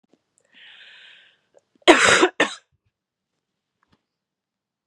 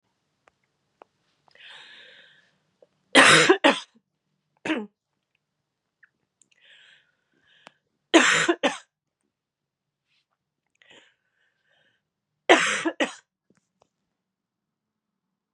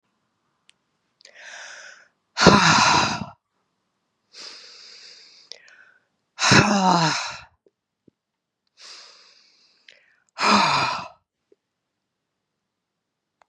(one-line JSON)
{"cough_length": "4.9 s", "cough_amplitude": 32767, "cough_signal_mean_std_ratio": 0.24, "three_cough_length": "15.5 s", "three_cough_amplitude": 32084, "three_cough_signal_mean_std_ratio": 0.24, "exhalation_length": "13.5 s", "exhalation_amplitude": 32768, "exhalation_signal_mean_std_ratio": 0.33, "survey_phase": "beta (2021-08-13 to 2022-03-07)", "age": "45-64", "gender": "Female", "wearing_mask": "No", "symptom_cough_any": true, "symptom_runny_or_blocked_nose": true, "symptom_sore_throat": true, "symptom_fatigue": true, "symptom_headache": true, "symptom_onset": "3 days", "smoker_status": "Never smoked", "respiratory_condition_asthma": false, "respiratory_condition_other": false, "recruitment_source": "Test and Trace", "submission_delay": "1 day", "covid_test_result": "Positive", "covid_test_method": "RT-qPCR", "covid_ct_value": 20.7, "covid_ct_gene": "ORF1ab gene", "covid_ct_mean": 21.1, "covid_viral_load": "120000 copies/ml", "covid_viral_load_category": "Low viral load (10K-1M copies/ml)"}